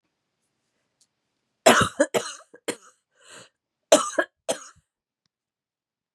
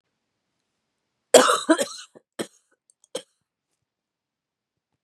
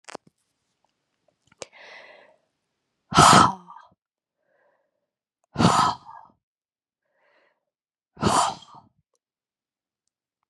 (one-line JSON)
{"cough_length": "6.1 s", "cough_amplitude": 30650, "cough_signal_mean_std_ratio": 0.24, "three_cough_length": "5.0 s", "three_cough_amplitude": 32768, "three_cough_signal_mean_std_ratio": 0.21, "exhalation_length": "10.5 s", "exhalation_amplitude": 27194, "exhalation_signal_mean_std_ratio": 0.24, "survey_phase": "beta (2021-08-13 to 2022-03-07)", "age": "45-64", "gender": "Female", "wearing_mask": "No", "symptom_cough_any": true, "symptom_runny_or_blocked_nose": true, "symptom_shortness_of_breath": true, "symptom_sore_throat": true, "symptom_fatigue": true, "symptom_headache": true, "symptom_onset": "3 days", "smoker_status": "Never smoked", "respiratory_condition_asthma": false, "respiratory_condition_other": false, "recruitment_source": "Test and Trace", "submission_delay": "1 day", "covid_test_result": "Positive", "covid_test_method": "RT-qPCR", "covid_ct_value": 16.1, "covid_ct_gene": "N gene", "covid_ct_mean": 16.4, "covid_viral_load": "4200000 copies/ml", "covid_viral_load_category": "High viral load (>1M copies/ml)"}